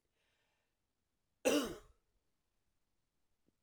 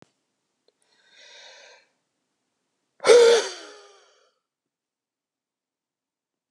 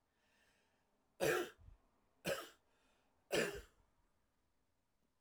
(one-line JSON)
{"cough_length": "3.6 s", "cough_amplitude": 3422, "cough_signal_mean_std_ratio": 0.22, "exhalation_length": "6.5 s", "exhalation_amplitude": 25526, "exhalation_signal_mean_std_ratio": 0.22, "three_cough_length": "5.2 s", "three_cough_amplitude": 2057, "three_cough_signal_mean_std_ratio": 0.31, "survey_phase": "alpha (2021-03-01 to 2021-08-12)", "age": "45-64", "gender": "Male", "wearing_mask": "No", "symptom_none": true, "smoker_status": "Never smoked", "respiratory_condition_asthma": false, "respiratory_condition_other": false, "recruitment_source": "REACT", "submission_delay": "2 days", "covid_test_result": "Negative", "covid_test_method": "RT-qPCR"}